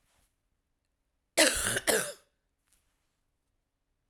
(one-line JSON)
{"cough_length": "4.1 s", "cough_amplitude": 15263, "cough_signal_mean_std_ratio": 0.29, "survey_phase": "beta (2021-08-13 to 2022-03-07)", "age": "45-64", "gender": "Female", "wearing_mask": "No", "symptom_cough_any": true, "symptom_new_continuous_cough": true, "symptom_runny_or_blocked_nose": true, "symptom_shortness_of_breath": true, "symptom_sore_throat": true, "symptom_fatigue": true, "symptom_headache": true, "symptom_change_to_sense_of_smell_or_taste": true, "symptom_loss_of_taste": true, "symptom_other": true, "symptom_onset": "3 days", "smoker_status": "Ex-smoker", "respiratory_condition_asthma": false, "respiratory_condition_other": false, "recruitment_source": "Test and Trace", "submission_delay": "2 days", "covid_test_result": "Positive", "covid_test_method": "RT-qPCR", "covid_ct_value": 20.2, "covid_ct_gene": "ORF1ab gene"}